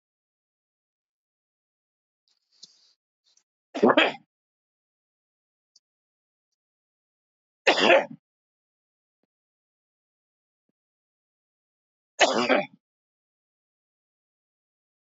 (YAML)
three_cough_length: 15.0 s
three_cough_amplitude: 16423
three_cough_signal_mean_std_ratio: 0.2
survey_phase: alpha (2021-03-01 to 2021-08-12)
age: 65+
gender: Male
wearing_mask: 'No'
symptom_cough_any: true
symptom_onset: 3 days
smoker_status: Never smoked
respiratory_condition_asthma: false
respiratory_condition_other: false
recruitment_source: Test and Trace
submission_delay: 2 days
covid_test_result: Positive
covid_test_method: RT-qPCR
covid_ct_value: 14.8
covid_ct_gene: ORF1ab gene
covid_ct_mean: 15.2
covid_viral_load: 10000000 copies/ml
covid_viral_load_category: High viral load (>1M copies/ml)